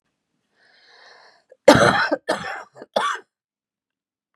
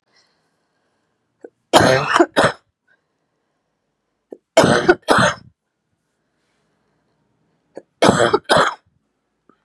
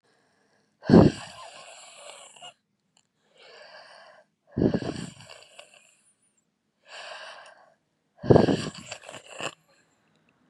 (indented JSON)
{
  "cough_length": "4.4 s",
  "cough_amplitude": 32768,
  "cough_signal_mean_std_ratio": 0.31,
  "three_cough_length": "9.6 s",
  "three_cough_amplitude": 32768,
  "three_cough_signal_mean_std_ratio": 0.33,
  "exhalation_length": "10.5 s",
  "exhalation_amplitude": 29586,
  "exhalation_signal_mean_std_ratio": 0.24,
  "survey_phase": "beta (2021-08-13 to 2022-03-07)",
  "age": "45-64",
  "gender": "Female",
  "wearing_mask": "No",
  "symptom_cough_any": true,
  "symptom_shortness_of_breath": true,
  "symptom_fatigue": true,
  "symptom_headache": true,
  "symptom_onset": "6 days",
  "smoker_status": "Never smoked",
  "respiratory_condition_asthma": false,
  "respiratory_condition_other": false,
  "recruitment_source": "REACT",
  "submission_delay": "1 day",
  "covid_test_result": "Negative",
  "covid_test_method": "RT-qPCR"
}